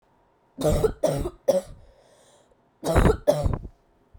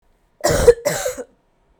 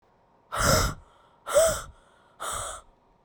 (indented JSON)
{
  "three_cough_length": "4.2 s",
  "three_cough_amplitude": 17630,
  "three_cough_signal_mean_std_ratio": 0.46,
  "cough_length": "1.8 s",
  "cough_amplitude": 32768,
  "cough_signal_mean_std_ratio": 0.4,
  "exhalation_length": "3.2 s",
  "exhalation_amplitude": 12664,
  "exhalation_signal_mean_std_ratio": 0.45,
  "survey_phase": "beta (2021-08-13 to 2022-03-07)",
  "age": "18-44",
  "gender": "Female",
  "wearing_mask": "No",
  "symptom_cough_any": true,
  "symptom_runny_or_blocked_nose": true,
  "symptom_shortness_of_breath": true,
  "symptom_sore_throat": true,
  "symptom_fatigue": true,
  "symptom_headache": true,
  "symptom_change_to_sense_of_smell_or_taste": true,
  "symptom_loss_of_taste": true,
  "symptom_onset": "8 days",
  "smoker_status": "Ex-smoker",
  "respiratory_condition_asthma": true,
  "respiratory_condition_other": false,
  "recruitment_source": "Test and Trace",
  "submission_delay": "1 day",
  "covid_test_result": "Positive",
  "covid_test_method": "RT-qPCR",
  "covid_ct_value": 15.1,
  "covid_ct_gene": "ORF1ab gene",
  "covid_ct_mean": 15.7,
  "covid_viral_load": "7300000 copies/ml",
  "covid_viral_load_category": "High viral load (>1M copies/ml)"
}